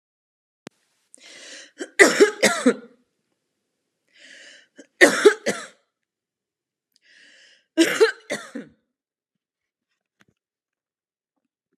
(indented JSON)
{
  "three_cough_length": "11.8 s",
  "three_cough_amplitude": 32768,
  "three_cough_signal_mean_std_ratio": 0.25,
  "survey_phase": "alpha (2021-03-01 to 2021-08-12)",
  "age": "45-64",
  "gender": "Female",
  "wearing_mask": "No",
  "symptom_fatigue": true,
  "smoker_status": "Never smoked",
  "respiratory_condition_asthma": true,
  "respiratory_condition_other": false,
  "recruitment_source": "REACT",
  "submission_delay": "2 days",
  "covid_test_result": "Negative",
  "covid_test_method": "RT-qPCR"
}